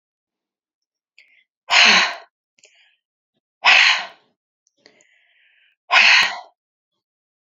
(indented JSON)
{
  "exhalation_length": "7.4 s",
  "exhalation_amplitude": 32286,
  "exhalation_signal_mean_std_ratio": 0.32,
  "survey_phase": "beta (2021-08-13 to 2022-03-07)",
  "age": "18-44",
  "gender": "Female",
  "wearing_mask": "No",
  "symptom_runny_or_blocked_nose": true,
  "symptom_other": true,
  "smoker_status": "Never smoked",
  "respiratory_condition_asthma": false,
  "respiratory_condition_other": false,
  "recruitment_source": "Test and Trace",
  "submission_delay": "2 days",
  "covid_test_result": "Positive",
  "covid_test_method": "RT-qPCR",
  "covid_ct_value": 13.7,
  "covid_ct_gene": "N gene",
  "covid_ct_mean": 14.5,
  "covid_viral_load": "18000000 copies/ml",
  "covid_viral_load_category": "High viral load (>1M copies/ml)"
}